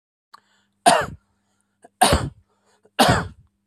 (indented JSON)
{
  "three_cough_length": "3.7 s",
  "three_cough_amplitude": 28172,
  "three_cough_signal_mean_std_ratio": 0.34,
  "survey_phase": "beta (2021-08-13 to 2022-03-07)",
  "age": "45-64",
  "gender": "Male",
  "wearing_mask": "No",
  "symptom_none": true,
  "smoker_status": "Ex-smoker",
  "respiratory_condition_asthma": false,
  "respiratory_condition_other": false,
  "recruitment_source": "REACT",
  "submission_delay": "1 day",
  "covid_test_result": "Negative",
  "covid_test_method": "RT-qPCR"
}